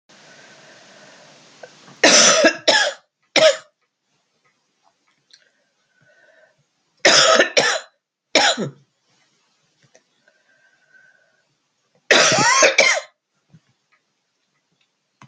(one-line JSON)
{"three_cough_length": "15.3 s", "three_cough_amplitude": 32768, "three_cough_signal_mean_std_ratio": 0.35, "survey_phase": "beta (2021-08-13 to 2022-03-07)", "age": "45-64", "gender": "Female", "wearing_mask": "No", "symptom_cough_any": true, "symptom_sore_throat": true, "symptom_fatigue": true, "symptom_fever_high_temperature": true, "symptom_headache": true, "symptom_other": true, "smoker_status": "Never smoked", "respiratory_condition_asthma": false, "respiratory_condition_other": false, "recruitment_source": "Test and Trace", "submission_delay": "2 days", "covid_test_result": "Positive", "covid_test_method": "LFT"}